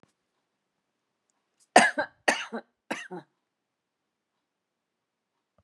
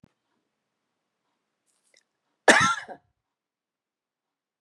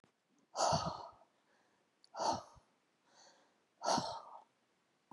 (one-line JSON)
{"three_cough_length": "5.6 s", "three_cough_amplitude": 29361, "three_cough_signal_mean_std_ratio": 0.19, "cough_length": "4.6 s", "cough_amplitude": 27608, "cough_signal_mean_std_ratio": 0.19, "exhalation_length": "5.1 s", "exhalation_amplitude": 3346, "exhalation_signal_mean_std_ratio": 0.37, "survey_phase": "beta (2021-08-13 to 2022-03-07)", "age": "65+", "gender": "Female", "wearing_mask": "No", "symptom_none": true, "symptom_onset": "12 days", "smoker_status": "Never smoked", "respiratory_condition_asthma": false, "respiratory_condition_other": false, "recruitment_source": "REACT", "submission_delay": "2 days", "covid_test_result": "Negative", "covid_test_method": "RT-qPCR"}